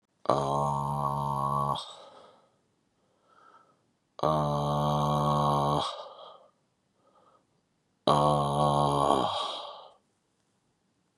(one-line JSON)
{"exhalation_length": "11.2 s", "exhalation_amplitude": 16189, "exhalation_signal_mean_std_ratio": 0.54, "survey_phase": "beta (2021-08-13 to 2022-03-07)", "age": "45-64", "gender": "Male", "wearing_mask": "No", "symptom_cough_any": true, "symptom_sore_throat": true, "symptom_fatigue": true, "symptom_onset": "3 days", "smoker_status": "Never smoked", "respiratory_condition_asthma": false, "respiratory_condition_other": false, "recruitment_source": "REACT", "submission_delay": "1 day", "covid_test_result": "Positive", "covid_test_method": "RT-qPCR", "covid_ct_value": 24.9, "covid_ct_gene": "E gene", "influenza_a_test_result": "Negative", "influenza_b_test_result": "Negative"}